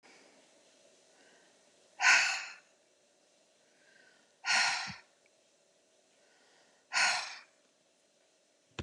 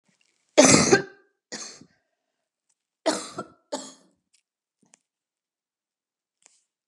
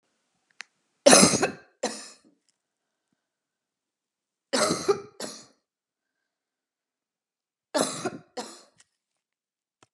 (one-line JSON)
{"exhalation_length": "8.8 s", "exhalation_amplitude": 8664, "exhalation_signal_mean_std_ratio": 0.3, "cough_length": "6.9 s", "cough_amplitude": 28862, "cough_signal_mean_std_ratio": 0.23, "three_cough_length": "9.9 s", "three_cough_amplitude": 31786, "three_cough_signal_mean_std_ratio": 0.24, "survey_phase": "beta (2021-08-13 to 2022-03-07)", "age": "65+", "gender": "Female", "wearing_mask": "No", "symptom_none": true, "smoker_status": "Ex-smoker", "respiratory_condition_asthma": false, "respiratory_condition_other": false, "recruitment_source": "REACT", "submission_delay": "2 days", "covid_test_result": "Negative", "covid_test_method": "RT-qPCR", "influenza_a_test_result": "Negative", "influenza_b_test_result": "Negative"}